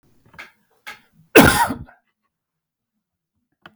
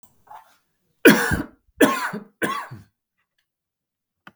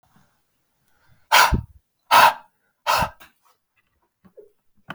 {"cough_length": "3.8 s", "cough_amplitude": 32768, "cough_signal_mean_std_ratio": 0.23, "three_cough_length": "4.4 s", "three_cough_amplitude": 32768, "three_cough_signal_mean_std_ratio": 0.3, "exhalation_length": "4.9 s", "exhalation_amplitude": 32768, "exhalation_signal_mean_std_ratio": 0.29, "survey_phase": "beta (2021-08-13 to 2022-03-07)", "age": "45-64", "gender": "Male", "wearing_mask": "No", "symptom_none": true, "smoker_status": "Ex-smoker", "respiratory_condition_asthma": false, "respiratory_condition_other": false, "recruitment_source": "REACT", "submission_delay": "2 days", "covid_test_result": "Negative", "covid_test_method": "RT-qPCR"}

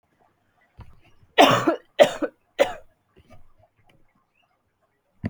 {"three_cough_length": "5.3 s", "three_cough_amplitude": 27352, "three_cough_signal_mean_std_ratio": 0.26, "survey_phase": "alpha (2021-03-01 to 2021-08-12)", "age": "18-44", "gender": "Female", "wearing_mask": "No", "symptom_headache": true, "smoker_status": "Never smoked", "respiratory_condition_asthma": false, "respiratory_condition_other": false, "recruitment_source": "Test and Trace", "submission_delay": "1 day", "covid_test_result": "Positive", "covid_test_method": "RT-qPCR", "covid_ct_value": 18.5, "covid_ct_gene": "ORF1ab gene", "covid_ct_mean": 19.3, "covid_viral_load": "460000 copies/ml", "covid_viral_load_category": "Low viral load (10K-1M copies/ml)"}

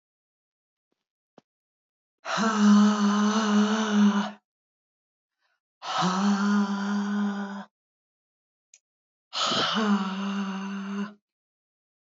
{"exhalation_length": "12.0 s", "exhalation_amplitude": 9897, "exhalation_signal_mean_std_ratio": 0.59, "survey_phase": "alpha (2021-03-01 to 2021-08-12)", "age": "45-64", "gender": "Female", "wearing_mask": "No", "symptom_none": true, "symptom_onset": "6 days", "smoker_status": "Ex-smoker", "respiratory_condition_asthma": false, "respiratory_condition_other": false, "recruitment_source": "REACT", "submission_delay": "1 day", "covid_test_result": "Negative", "covid_test_method": "RT-qPCR"}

